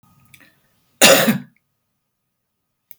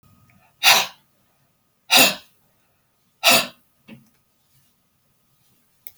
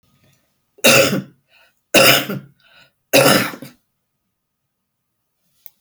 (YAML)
cough_length: 3.0 s
cough_amplitude: 32768
cough_signal_mean_std_ratio: 0.27
exhalation_length: 6.0 s
exhalation_amplitude: 31317
exhalation_signal_mean_std_ratio: 0.26
three_cough_length: 5.8 s
three_cough_amplitude: 32768
three_cough_signal_mean_std_ratio: 0.35
survey_phase: beta (2021-08-13 to 2022-03-07)
age: 65+
gender: Female
wearing_mask: 'No'
symptom_shortness_of_breath: true
symptom_sore_throat: true
symptom_onset: 12 days
smoker_status: Never smoked
respiratory_condition_asthma: false
respiratory_condition_other: true
recruitment_source: REACT
submission_delay: 2 days
covid_test_result: Negative
covid_test_method: RT-qPCR